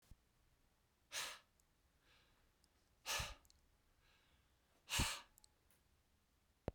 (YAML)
exhalation_length: 6.7 s
exhalation_amplitude: 1558
exhalation_signal_mean_std_ratio: 0.3
survey_phase: beta (2021-08-13 to 2022-03-07)
age: 45-64
gender: Male
wearing_mask: 'No'
symptom_new_continuous_cough: true
smoker_status: Never smoked
respiratory_condition_asthma: false
respiratory_condition_other: false
recruitment_source: Test and Trace
submission_delay: 2 days
covid_test_result: Positive
covid_test_method: RT-qPCR
covid_ct_value: 37.1
covid_ct_gene: N gene